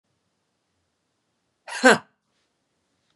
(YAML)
cough_length: 3.2 s
cough_amplitude: 32614
cough_signal_mean_std_ratio: 0.17
survey_phase: beta (2021-08-13 to 2022-03-07)
age: 18-44
gender: Female
wearing_mask: 'Yes'
symptom_fatigue: true
symptom_headache: true
symptom_change_to_sense_of_smell_or_taste: true
symptom_loss_of_taste: true
symptom_onset: 3 days
smoker_status: Never smoked
respiratory_condition_asthma: true
respiratory_condition_other: false
recruitment_source: Test and Trace
submission_delay: 2 days
covid_test_result: Positive
covid_test_method: RT-qPCR
covid_ct_value: 17.5
covid_ct_gene: N gene
covid_ct_mean: 17.8
covid_viral_load: 1500000 copies/ml
covid_viral_load_category: High viral load (>1M copies/ml)